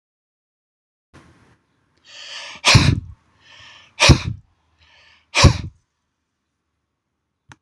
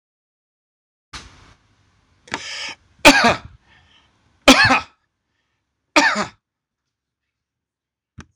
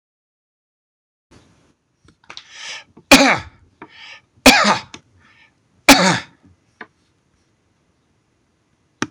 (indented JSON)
{
  "exhalation_length": "7.6 s",
  "exhalation_amplitude": 26028,
  "exhalation_signal_mean_std_ratio": 0.26,
  "cough_length": "8.4 s",
  "cough_amplitude": 26028,
  "cough_signal_mean_std_ratio": 0.26,
  "three_cough_length": "9.1 s",
  "three_cough_amplitude": 26028,
  "three_cough_signal_mean_std_ratio": 0.25,
  "survey_phase": "alpha (2021-03-01 to 2021-08-12)",
  "age": "65+",
  "gender": "Male",
  "wearing_mask": "No",
  "symptom_none": true,
  "smoker_status": "Never smoked",
  "respiratory_condition_asthma": false,
  "respiratory_condition_other": false,
  "recruitment_source": "REACT",
  "submission_delay": "2 days",
  "covid_test_result": "Negative",
  "covid_test_method": "RT-qPCR"
}